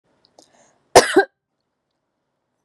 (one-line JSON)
{"cough_length": "2.6 s", "cough_amplitude": 32768, "cough_signal_mean_std_ratio": 0.2, "survey_phase": "beta (2021-08-13 to 2022-03-07)", "age": "18-44", "gender": "Female", "wearing_mask": "No", "symptom_none": true, "smoker_status": "Never smoked", "respiratory_condition_asthma": false, "respiratory_condition_other": false, "recruitment_source": "REACT", "submission_delay": "1 day", "covid_test_result": "Negative", "covid_test_method": "RT-qPCR", "influenza_a_test_result": "Negative", "influenza_b_test_result": "Negative"}